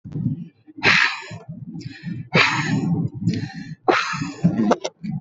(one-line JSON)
{"exhalation_length": "5.2 s", "exhalation_amplitude": 27332, "exhalation_signal_mean_std_ratio": 0.66, "survey_phase": "beta (2021-08-13 to 2022-03-07)", "age": "18-44", "gender": "Female", "wearing_mask": "No", "symptom_cough_any": true, "symptom_runny_or_blocked_nose": true, "symptom_onset": "4 days", "smoker_status": "Current smoker (11 or more cigarettes per day)", "respiratory_condition_asthma": false, "respiratory_condition_other": false, "recruitment_source": "Test and Trace", "submission_delay": "2 days", "covid_test_result": "Negative", "covid_test_method": "RT-qPCR"}